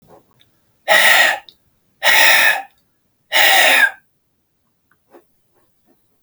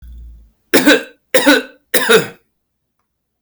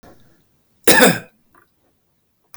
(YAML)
exhalation_length: 6.2 s
exhalation_amplitude: 32768
exhalation_signal_mean_std_ratio: 0.44
three_cough_length: 3.4 s
three_cough_amplitude: 32768
three_cough_signal_mean_std_ratio: 0.42
cough_length: 2.6 s
cough_amplitude: 32768
cough_signal_mean_std_ratio: 0.28
survey_phase: beta (2021-08-13 to 2022-03-07)
age: 18-44
gender: Male
wearing_mask: 'No'
symptom_none: true
smoker_status: Never smoked
respiratory_condition_asthma: false
respiratory_condition_other: false
recruitment_source: REACT
submission_delay: 2 days
covid_test_result: Negative
covid_test_method: RT-qPCR
influenza_a_test_result: Negative
influenza_b_test_result: Negative